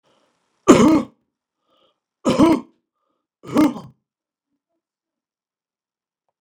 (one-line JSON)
{"three_cough_length": "6.4 s", "three_cough_amplitude": 32768, "three_cough_signal_mean_std_ratio": 0.28, "survey_phase": "beta (2021-08-13 to 2022-03-07)", "age": "65+", "gender": "Male", "wearing_mask": "No", "symptom_none": true, "smoker_status": "Ex-smoker", "respiratory_condition_asthma": false, "respiratory_condition_other": false, "recruitment_source": "REACT", "submission_delay": "1 day", "covid_test_result": "Negative", "covid_test_method": "RT-qPCR", "influenza_a_test_result": "Negative", "influenza_b_test_result": "Negative"}